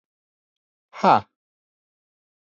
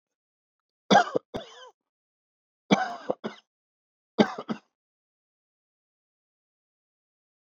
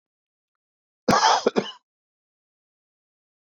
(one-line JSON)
{"exhalation_length": "2.6 s", "exhalation_amplitude": 26239, "exhalation_signal_mean_std_ratio": 0.19, "three_cough_length": "7.5 s", "three_cough_amplitude": 18336, "three_cough_signal_mean_std_ratio": 0.21, "cough_length": "3.6 s", "cough_amplitude": 18127, "cough_signal_mean_std_ratio": 0.28, "survey_phase": "beta (2021-08-13 to 2022-03-07)", "age": "45-64", "gender": "Male", "wearing_mask": "No", "symptom_fever_high_temperature": true, "symptom_headache": true, "smoker_status": "Ex-smoker", "respiratory_condition_asthma": false, "respiratory_condition_other": false, "recruitment_source": "REACT", "submission_delay": "3 days", "covid_test_result": "Negative", "covid_test_method": "RT-qPCR", "influenza_a_test_result": "Negative", "influenza_b_test_result": "Negative"}